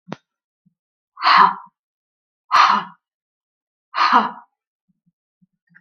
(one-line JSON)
{"exhalation_length": "5.8 s", "exhalation_amplitude": 32766, "exhalation_signal_mean_std_ratio": 0.32, "survey_phase": "beta (2021-08-13 to 2022-03-07)", "age": "65+", "gender": "Female", "wearing_mask": "No", "symptom_none": true, "smoker_status": "Never smoked", "respiratory_condition_asthma": false, "respiratory_condition_other": false, "recruitment_source": "REACT", "submission_delay": "6 days", "covid_test_result": "Negative", "covid_test_method": "RT-qPCR"}